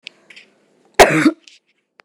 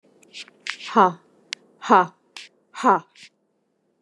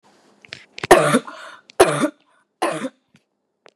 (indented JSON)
{
  "cough_length": "2.0 s",
  "cough_amplitude": 29204,
  "cough_signal_mean_std_ratio": 0.3,
  "exhalation_length": "4.0 s",
  "exhalation_amplitude": 26133,
  "exhalation_signal_mean_std_ratio": 0.29,
  "three_cough_length": "3.8 s",
  "three_cough_amplitude": 29204,
  "three_cough_signal_mean_std_ratio": 0.34,
  "survey_phase": "beta (2021-08-13 to 2022-03-07)",
  "age": "45-64",
  "gender": "Female",
  "wearing_mask": "No",
  "symptom_sore_throat": true,
  "symptom_onset": "8 days",
  "smoker_status": "Never smoked",
  "respiratory_condition_asthma": false,
  "respiratory_condition_other": false,
  "recruitment_source": "REACT",
  "submission_delay": "2 days",
  "covid_test_result": "Negative",
  "covid_test_method": "RT-qPCR",
  "covid_ct_value": 37.9,
  "covid_ct_gene": "N gene",
  "influenza_a_test_result": "Negative",
  "influenza_b_test_result": "Negative"
}